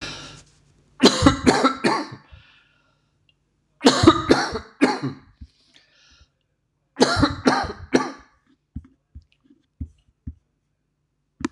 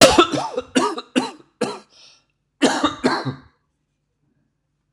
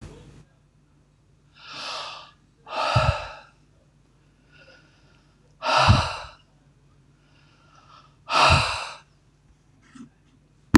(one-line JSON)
{"three_cough_length": "11.5 s", "three_cough_amplitude": 26028, "three_cough_signal_mean_std_ratio": 0.35, "cough_length": "4.9 s", "cough_amplitude": 26028, "cough_signal_mean_std_ratio": 0.39, "exhalation_length": "10.8 s", "exhalation_amplitude": 26028, "exhalation_signal_mean_std_ratio": 0.32, "survey_phase": "beta (2021-08-13 to 2022-03-07)", "age": "65+", "gender": "Male", "wearing_mask": "No", "symptom_none": true, "smoker_status": "Never smoked", "respiratory_condition_asthma": false, "respiratory_condition_other": false, "recruitment_source": "REACT", "submission_delay": "2 days", "covid_test_result": "Negative", "covid_test_method": "RT-qPCR", "influenza_a_test_result": "Negative", "influenza_b_test_result": "Negative"}